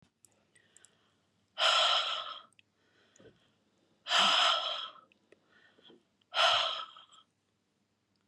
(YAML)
exhalation_length: 8.3 s
exhalation_amplitude: 7938
exhalation_signal_mean_std_ratio: 0.39
survey_phase: beta (2021-08-13 to 2022-03-07)
age: 45-64
gender: Female
wearing_mask: 'No'
symptom_none: true
smoker_status: Never smoked
respiratory_condition_asthma: false
respiratory_condition_other: false
recruitment_source: REACT
submission_delay: 32 days
covid_test_result: Negative
covid_test_method: RT-qPCR
influenza_a_test_result: Negative
influenza_b_test_result: Negative